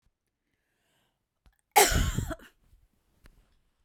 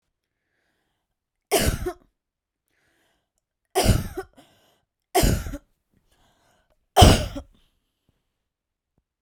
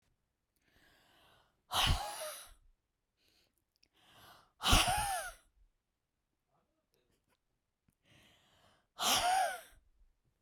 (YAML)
cough_length: 3.8 s
cough_amplitude: 16415
cough_signal_mean_std_ratio: 0.27
three_cough_length: 9.2 s
three_cough_amplitude: 32768
three_cough_signal_mean_std_ratio: 0.27
exhalation_length: 10.4 s
exhalation_amplitude: 8775
exhalation_signal_mean_std_ratio: 0.33
survey_phase: beta (2021-08-13 to 2022-03-07)
age: 18-44
gender: Female
wearing_mask: 'No'
symptom_none: true
smoker_status: Never smoked
respiratory_condition_asthma: false
respiratory_condition_other: false
recruitment_source: REACT
submission_delay: 2 days
covid_test_result: Negative
covid_test_method: RT-qPCR
influenza_a_test_result: Negative
influenza_b_test_result: Negative